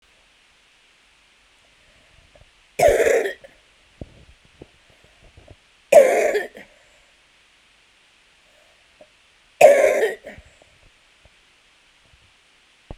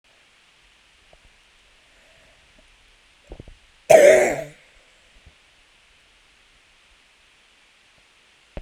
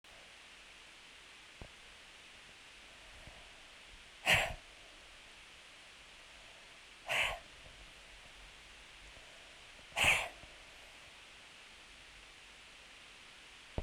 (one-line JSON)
{"three_cough_length": "13.0 s", "three_cough_amplitude": 32768, "three_cough_signal_mean_std_ratio": 0.27, "cough_length": "8.6 s", "cough_amplitude": 32768, "cough_signal_mean_std_ratio": 0.2, "exhalation_length": "13.8 s", "exhalation_amplitude": 5447, "exhalation_signal_mean_std_ratio": 0.37, "survey_phase": "beta (2021-08-13 to 2022-03-07)", "age": "65+", "gender": "Female", "wearing_mask": "No", "symptom_none": true, "smoker_status": "Ex-smoker", "respiratory_condition_asthma": true, "respiratory_condition_other": false, "recruitment_source": "REACT", "submission_delay": "3 days", "covid_test_result": "Negative", "covid_test_method": "RT-qPCR", "influenza_a_test_result": "Negative", "influenza_b_test_result": "Negative"}